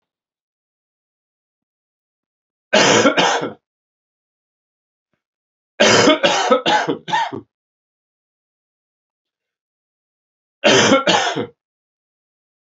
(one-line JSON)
{"three_cough_length": "12.8 s", "three_cough_amplitude": 29896, "three_cough_signal_mean_std_ratio": 0.37, "survey_phase": "beta (2021-08-13 to 2022-03-07)", "age": "45-64", "gender": "Male", "wearing_mask": "No", "symptom_cough_any": true, "symptom_runny_or_blocked_nose": true, "symptom_shortness_of_breath": true, "symptom_fatigue": true, "symptom_headache": true, "symptom_change_to_sense_of_smell_or_taste": true, "symptom_loss_of_taste": true, "symptom_other": true, "symptom_onset": "4 days", "smoker_status": "Never smoked", "respiratory_condition_asthma": false, "respiratory_condition_other": false, "recruitment_source": "Test and Trace", "submission_delay": "1 day", "covid_test_result": "Positive", "covid_test_method": "RT-qPCR", "covid_ct_value": 15.1, "covid_ct_gene": "ORF1ab gene", "covid_ct_mean": 15.6, "covid_viral_load": "7400000 copies/ml", "covid_viral_load_category": "High viral load (>1M copies/ml)"}